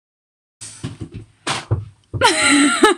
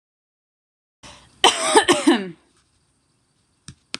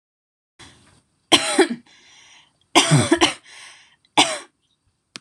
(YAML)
exhalation_length: 3.0 s
exhalation_amplitude: 26028
exhalation_signal_mean_std_ratio: 0.52
cough_length: 4.0 s
cough_amplitude: 26028
cough_signal_mean_std_ratio: 0.31
three_cough_length: 5.2 s
three_cough_amplitude: 26028
three_cough_signal_mean_std_ratio: 0.35
survey_phase: beta (2021-08-13 to 2022-03-07)
age: 18-44
gender: Female
wearing_mask: 'No'
symptom_none: true
smoker_status: Never smoked
respiratory_condition_asthma: false
respiratory_condition_other: false
recruitment_source: REACT
submission_delay: 4 days
covid_test_result: Negative
covid_test_method: RT-qPCR
influenza_a_test_result: Negative
influenza_b_test_result: Negative